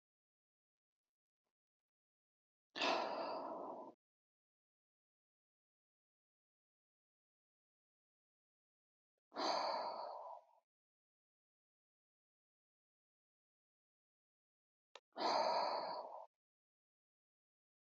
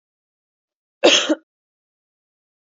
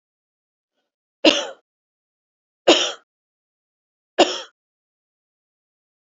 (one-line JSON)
{"exhalation_length": "17.8 s", "exhalation_amplitude": 1681, "exhalation_signal_mean_std_ratio": 0.31, "cough_length": "2.7 s", "cough_amplitude": 30017, "cough_signal_mean_std_ratio": 0.24, "three_cough_length": "6.1 s", "three_cough_amplitude": 30373, "three_cough_signal_mean_std_ratio": 0.22, "survey_phase": "beta (2021-08-13 to 2022-03-07)", "age": "18-44", "gender": "Female", "wearing_mask": "No", "symptom_none": true, "smoker_status": "Never smoked", "respiratory_condition_asthma": false, "respiratory_condition_other": false, "recruitment_source": "REACT", "submission_delay": "2 days", "covid_test_result": "Negative", "covid_test_method": "RT-qPCR", "influenza_a_test_result": "Negative", "influenza_b_test_result": "Negative"}